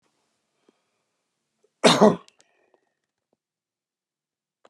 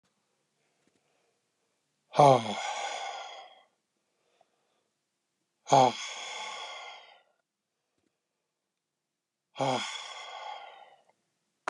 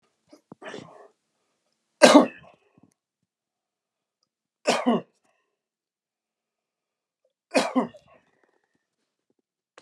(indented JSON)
{
  "cough_length": "4.7 s",
  "cough_amplitude": 26986,
  "cough_signal_mean_std_ratio": 0.18,
  "exhalation_length": "11.7 s",
  "exhalation_amplitude": 17043,
  "exhalation_signal_mean_std_ratio": 0.26,
  "three_cough_length": "9.8 s",
  "three_cough_amplitude": 32111,
  "three_cough_signal_mean_std_ratio": 0.2,
  "survey_phase": "beta (2021-08-13 to 2022-03-07)",
  "age": "65+",
  "gender": "Male",
  "wearing_mask": "No",
  "symptom_none": true,
  "smoker_status": "Never smoked",
  "respiratory_condition_asthma": false,
  "respiratory_condition_other": false,
  "recruitment_source": "REACT",
  "submission_delay": "2 days",
  "covid_test_result": "Negative",
  "covid_test_method": "RT-qPCR"
}